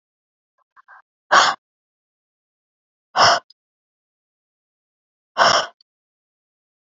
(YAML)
exhalation_length: 7.0 s
exhalation_amplitude: 32767
exhalation_signal_mean_std_ratio: 0.25
survey_phase: beta (2021-08-13 to 2022-03-07)
age: 45-64
gender: Female
wearing_mask: 'No'
symptom_none: true
symptom_onset: 12 days
smoker_status: Never smoked
respiratory_condition_asthma: true
respiratory_condition_other: false
recruitment_source: REACT
submission_delay: 1 day
covid_test_result: Negative
covid_test_method: RT-qPCR